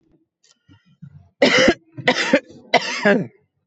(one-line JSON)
{"three_cough_length": "3.7 s", "three_cough_amplitude": 25591, "three_cough_signal_mean_std_ratio": 0.43, "survey_phase": "beta (2021-08-13 to 2022-03-07)", "age": "18-44", "gender": "Female", "wearing_mask": "No", "symptom_cough_any": true, "symptom_runny_or_blocked_nose": true, "symptom_onset": "4 days", "smoker_status": "Current smoker (11 or more cigarettes per day)", "respiratory_condition_asthma": false, "respiratory_condition_other": false, "recruitment_source": "Test and Trace", "submission_delay": "2 days", "covid_test_result": "Negative", "covid_test_method": "RT-qPCR"}